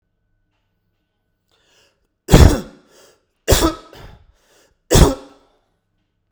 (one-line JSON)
{"three_cough_length": "6.3 s", "three_cough_amplitude": 32768, "three_cough_signal_mean_std_ratio": 0.26, "survey_phase": "beta (2021-08-13 to 2022-03-07)", "age": "45-64", "gender": "Male", "wearing_mask": "No", "symptom_none": true, "smoker_status": "Ex-smoker", "respiratory_condition_asthma": true, "respiratory_condition_other": false, "recruitment_source": "REACT", "submission_delay": "1 day", "covid_test_result": "Negative", "covid_test_method": "RT-qPCR"}